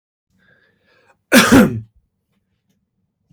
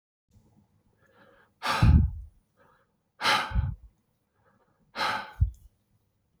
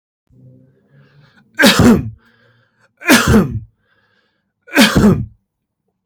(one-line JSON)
{"cough_length": "3.3 s", "cough_amplitude": 32767, "cough_signal_mean_std_ratio": 0.29, "exhalation_length": "6.4 s", "exhalation_amplitude": 12011, "exhalation_signal_mean_std_ratio": 0.34, "three_cough_length": "6.1 s", "three_cough_amplitude": 32768, "three_cough_signal_mean_std_ratio": 0.4, "survey_phase": "beta (2021-08-13 to 2022-03-07)", "age": "45-64", "gender": "Male", "wearing_mask": "No", "symptom_none": true, "smoker_status": "Never smoked", "respiratory_condition_asthma": true, "respiratory_condition_other": false, "recruitment_source": "REACT", "submission_delay": "0 days", "covid_test_result": "Negative", "covid_test_method": "RT-qPCR", "influenza_a_test_result": "Negative", "influenza_b_test_result": "Negative"}